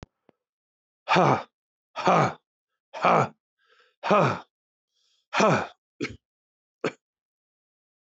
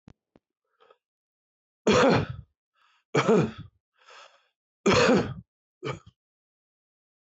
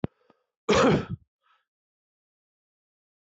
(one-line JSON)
{"exhalation_length": "8.1 s", "exhalation_amplitude": 17233, "exhalation_signal_mean_std_ratio": 0.34, "three_cough_length": "7.3 s", "three_cough_amplitude": 12782, "three_cough_signal_mean_std_ratio": 0.34, "cough_length": "3.2 s", "cough_amplitude": 12017, "cough_signal_mean_std_ratio": 0.28, "survey_phase": "beta (2021-08-13 to 2022-03-07)", "age": "45-64", "gender": "Male", "wearing_mask": "No", "symptom_cough_any": true, "symptom_shortness_of_breath": true, "symptom_sore_throat": true, "symptom_fatigue": true, "smoker_status": "Never smoked", "respiratory_condition_asthma": true, "respiratory_condition_other": false, "recruitment_source": "Test and Trace", "submission_delay": "4 days", "covid_test_result": "Negative", "covid_test_method": "RT-qPCR"}